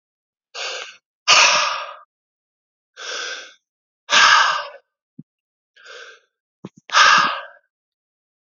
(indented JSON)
{
  "exhalation_length": "8.5 s",
  "exhalation_amplitude": 32511,
  "exhalation_signal_mean_std_ratio": 0.37,
  "survey_phase": "beta (2021-08-13 to 2022-03-07)",
  "age": "45-64",
  "gender": "Male",
  "wearing_mask": "No",
  "symptom_cough_any": true,
  "symptom_runny_or_blocked_nose": true,
  "symptom_sore_throat": true,
  "symptom_change_to_sense_of_smell_or_taste": true,
  "symptom_onset": "6 days",
  "smoker_status": "Ex-smoker",
  "respiratory_condition_asthma": false,
  "respiratory_condition_other": false,
  "recruitment_source": "Test and Trace",
  "submission_delay": "1 day",
  "covid_test_result": "Positive",
  "covid_test_method": "ePCR"
}